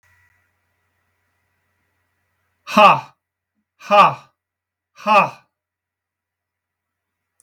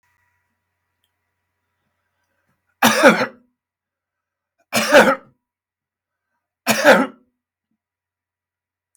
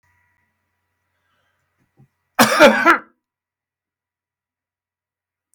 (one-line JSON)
{"exhalation_length": "7.4 s", "exhalation_amplitude": 32766, "exhalation_signal_mean_std_ratio": 0.24, "three_cough_length": "9.0 s", "three_cough_amplitude": 32768, "three_cough_signal_mean_std_ratio": 0.27, "cough_length": "5.5 s", "cough_amplitude": 32767, "cough_signal_mean_std_ratio": 0.24, "survey_phase": "beta (2021-08-13 to 2022-03-07)", "age": "65+", "gender": "Male", "wearing_mask": "No", "symptom_none": true, "smoker_status": "Never smoked", "respiratory_condition_asthma": false, "respiratory_condition_other": false, "recruitment_source": "REACT", "submission_delay": "3 days", "covid_test_result": "Negative", "covid_test_method": "RT-qPCR", "influenza_a_test_result": "Negative", "influenza_b_test_result": "Negative"}